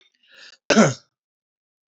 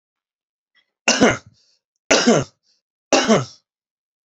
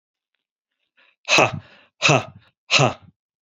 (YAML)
cough_length: 1.9 s
cough_amplitude: 27054
cough_signal_mean_std_ratio: 0.27
three_cough_length: 4.3 s
three_cough_amplitude: 30190
three_cough_signal_mean_std_ratio: 0.36
exhalation_length: 3.4 s
exhalation_amplitude: 31075
exhalation_signal_mean_std_ratio: 0.34
survey_phase: beta (2021-08-13 to 2022-03-07)
age: 45-64
gender: Male
wearing_mask: 'No'
symptom_none: true
smoker_status: Never smoked
respiratory_condition_asthma: false
respiratory_condition_other: false
recruitment_source: REACT
submission_delay: 2 days
covid_test_result: Negative
covid_test_method: RT-qPCR
influenza_a_test_result: Negative
influenza_b_test_result: Negative